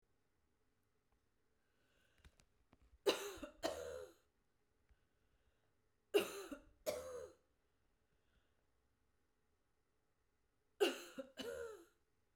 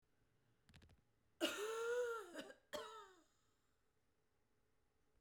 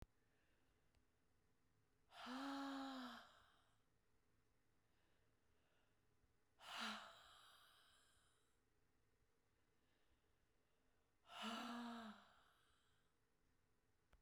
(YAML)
three_cough_length: 12.4 s
three_cough_amplitude: 2666
three_cough_signal_mean_std_ratio: 0.28
cough_length: 5.2 s
cough_amplitude: 1463
cough_signal_mean_std_ratio: 0.42
exhalation_length: 14.2 s
exhalation_amplitude: 404
exhalation_signal_mean_std_ratio: 0.43
survey_phase: beta (2021-08-13 to 2022-03-07)
age: 45-64
gender: Female
wearing_mask: 'No'
symptom_none: true
smoker_status: Never smoked
respiratory_condition_asthma: true
respiratory_condition_other: false
recruitment_source: REACT
submission_delay: 1 day
covid_test_result: Negative
covid_test_method: RT-qPCR